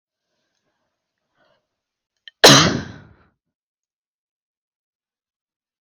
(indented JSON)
{
  "cough_length": "5.8 s",
  "cough_amplitude": 32768,
  "cough_signal_mean_std_ratio": 0.19,
  "survey_phase": "beta (2021-08-13 to 2022-03-07)",
  "age": "18-44",
  "gender": "Female",
  "wearing_mask": "No",
  "symptom_cough_any": true,
  "smoker_status": "Never smoked",
  "respiratory_condition_asthma": false,
  "respiratory_condition_other": false,
  "recruitment_source": "REACT",
  "submission_delay": "0 days",
  "covid_test_result": "Negative",
  "covid_test_method": "RT-qPCR",
  "influenza_a_test_result": "Negative",
  "influenza_b_test_result": "Negative"
}